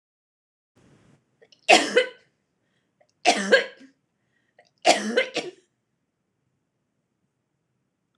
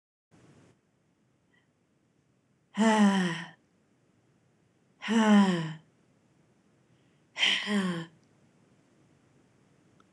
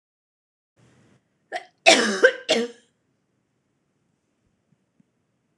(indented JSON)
{
  "three_cough_length": "8.2 s",
  "three_cough_amplitude": 26027,
  "three_cough_signal_mean_std_ratio": 0.26,
  "exhalation_length": "10.1 s",
  "exhalation_amplitude": 9840,
  "exhalation_signal_mean_std_ratio": 0.35,
  "cough_length": "5.6 s",
  "cough_amplitude": 26028,
  "cough_signal_mean_std_ratio": 0.24,
  "survey_phase": "beta (2021-08-13 to 2022-03-07)",
  "age": "65+",
  "gender": "Female",
  "wearing_mask": "No",
  "symptom_none": true,
  "smoker_status": "Never smoked",
  "respiratory_condition_asthma": false,
  "respiratory_condition_other": false,
  "recruitment_source": "REACT",
  "submission_delay": "2 days",
  "covid_test_result": "Negative",
  "covid_test_method": "RT-qPCR",
  "influenza_a_test_result": "Negative",
  "influenza_b_test_result": "Negative"
}